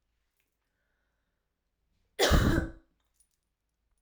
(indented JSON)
{
  "cough_length": "4.0 s",
  "cough_amplitude": 9534,
  "cough_signal_mean_std_ratio": 0.28,
  "survey_phase": "alpha (2021-03-01 to 2021-08-12)",
  "age": "18-44",
  "gender": "Female",
  "wearing_mask": "No",
  "symptom_cough_any": true,
  "symptom_shortness_of_breath": true,
  "symptom_fatigue": true,
  "symptom_fever_high_temperature": true,
  "symptom_headache": true,
  "smoker_status": "Never smoked",
  "respiratory_condition_asthma": false,
  "respiratory_condition_other": false,
  "recruitment_source": "Test and Trace",
  "submission_delay": "2 days",
  "covid_test_result": "Positive",
  "covid_test_method": "LFT"
}